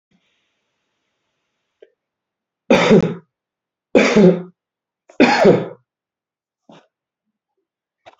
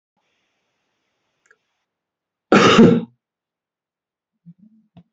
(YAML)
three_cough_length: 8.2 s
three_cough_amplitude: 27613
three_cough_signal_mean_std_ratio: 0.31
cough_length: 5.1 s
cough_amplitude: 32767
cough_signal_mean_std_ratio: 0.25
survey_phase: beta (2021-08-13 to 2022-03-07)
age: 45-64
gender: Male
wearing_mask: 'No'
symptom_runny_or_blocked_nose: true
symptom_shortness_of_breath: true
symptom_sore_throat: true
symptom_fatigue: true
symptom_change_to_sense_of_smell_or_taste: true
symptom_loss_of_taste: true
symptom_onset: 5 days
smoker_status: Never smoked
respiratory_condition_asthma: false
respiratory_condition_other: false
recruitment_source: Test and Trace
submission_delay: 2 days
covid_test_result: Positive
covid_test_method: RT-qPCR